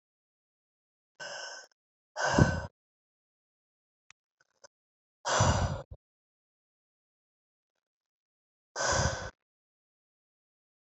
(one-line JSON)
{"exhalation_length": "10.9 s", "exhalation_amplitude": 12779, "exhalation_signal_mean_std_ratio": 0.28, "survey_phase": "beta (2021-08-13 to 2022-03-07)", "age": "45-64", "gender": "Female", "wearing_mask": "No", "symptom_cough_any": true, "symptom_new_continuous_cough": true, "symptom_runny_or_blocked_nose": true, "symptom_shortness_of_breath": true, "symptom_sore_throat": true, "symptom_abdominal_pain": true, "symptom_fatigue": true, "symptom_fever_high_temperature": true, "symptom_headache": true, "symptom_change_to_sense_of_smell_or_taste": true, "symptom_loss_of_taste": true, "symptom_onset": "2 days", "smoker_status": "Never smoked", "respiratory_condition_asthma": false, "respiratory_condition_other": false, "recruitment_source": "Test and Trace", "submission_delay": "2 days", "covid_test_result": "Positive", "covid_test_method": "ePCR"}